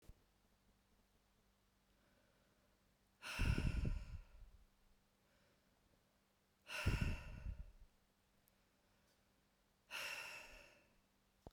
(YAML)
exhalation_length: 11.5 s
exhalation_amplitude: 1498
exhalation_signal_mean_std_ratio: 0.35
survey_phase: beta (2021-08-13 to 2022-03-07)
age: 18-44
gender: Female
wearing_mask: 'No'
symptom_none: true
smoker_status: Ex-smoker
respiratory_condition_asthma: false
respiratory_condition_other: false
recruitment_source: REACT
submission_delay: 4 days
covid_test_result: Negative
covid_test_method: RT-qPCR
influenza_a_test_result: Negative
influenza_b_test_result: Negative